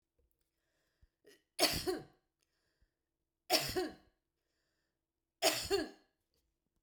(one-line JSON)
{"three_cough_length": "6.8 s", "three_cough_amplitude": 5891, "three_cough_signal_mean_std_ratio": 0.31, "survey_phase": "beta (2021-08-13 to 2022-03-07)", "age": "65+", "gender": "Female", "wearing_mask": "No", "symptom_none": true, "smoker_status": "Never smoked", "respiratory_condition_asthma": false, "respiratory_condition_other": false, "recruitment_source": "REACT", "submission_delay": "2 days", "covid_test_result": "Negative", "covid_test_method": "RT-qPCR", "influenza_a_test_result": "Negative", "influenza_b_test_result": "Negative"}